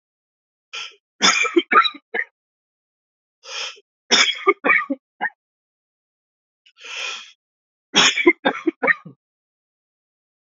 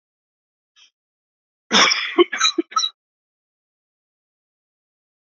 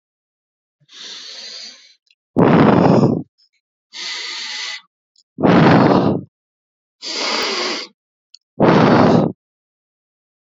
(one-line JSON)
{"three_cough_length": "10.5 s", "three_cough_amplitude": 29614, "three_cough_signal_mean_std_ratio": 0.34, "cough_length": "5.2 s", "cough_amplitude": 30573, "cough_signal_mean_std_ratio": 0.28, "exhalation_length": "10.5 s", "exhalation_amplitude": 32768, "exhalation_signal_mean_std_ratio": 0.47, "survey_phase": "beta (2021-08-13 to 2022-03-07)", "age": "18-44", "gender": "Male", "wearing_mask": "No", "symptom_cough_any": true, "symptom_runny_or_blocked_nose": true, "symptom_fatigue": true, "symptom_fever_high_temperature": true, "symptom_headache": true, "smoker_status": "Never smoked", "respiratory_condition_asthma": false, "respiratory_condition_other": false, "recruitment_source": "Test and Trace", "submission_delay": "2 days", "covid_test_result": "Positive", "covid_test_method": "LFT"}